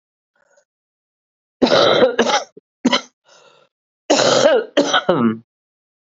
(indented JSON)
{
  "cough_length": "6.1 s",
  "cough_amplitude": 32721,
  "cough_signal_mean_std_ratio": 0.47,
  "survey_phase": "beta (2021-08-13 to 2022-03-07)",
  "age": "45-64",
  "gender": "Female",
  "wearing_mask": "No",
  "symptom_cough_any": true,
  "symptom_runny_or_blocked_nose": true,
  "symptom_sore_throat": true,
  "symptom_abdominal_pain": true,
  "symptom_fatigue": true,
  "symptom_headache": true,
  "symptom_change_to_sense_of_smell_or_taste": true,
  "smoker_status": "Never smoked",
  "respiratory_condition_asthma": false,
  "respiratory_condition_other": false,
  "recruitment_source": "Test and Trace",
  "submission_delay": "1 day",
  "covid_test_result": "Positive",
  "covid_test_method": "RT-qPCR",
  "covid_ct_value": 18.2,
  "covid_ct_gene": "S gene",
  "covid_ct_mean": 19.5,
  "covid_viral_load": "390000 copies/ml",
  "covid_viral_load_category": "Low viral load (10K-1M copies/ml)"
}